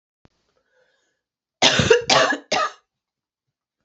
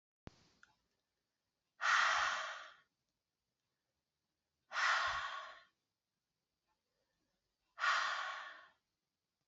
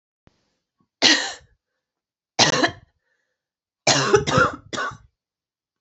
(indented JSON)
{
  "cough_length": "3.8 s",
  "cough_amplitude": 30043,
  "cough_signal_mean_std_ratio": 0.36,
  "exhalation_length": "9.5 s",
  "exhalation_amplitude": 3325,
  "exhalation_signal_mean_std_ratio": 0.37,
  "three_cough_length": "5.8 s",
  "three_cough_amplitude": 31587,
  "three_cough_signal_mean_std_ratio": 0.37,
  "survey_phase": "alpha (2021-03-01 to 2021-08-12)",
  "age": "45-64",
  "gender": "Female",
  "wearing_mask": "No",
  "symptom_cough_any": true,
  "symptom_fatigue": true,
  "symptom_headache": true,
  "symptom_change_to_sense_of_smell_or_taste": true,
  "symptom_onset": "2 days",
  "smoker_status": "Never smoked",
  "respiratory_condition_asthma": false,
  "respiratory_condition_other": false,
  "recruitment_source": "Test and Trace",
  "submission_delay": "1 day",
  "covid_test_result": "Positive",
  "covid_test_method": "RT-qPCR",
  "covid_ct_value": 14.0,
  "covid_ct_gene": "ORF1ab gene",
  "covid_ct_mean": 14.6,
  "covid_viral_load": "17000000 copies/ml",
  "covid_viral_load_category": "High viral load (>1M copies/ml)"
}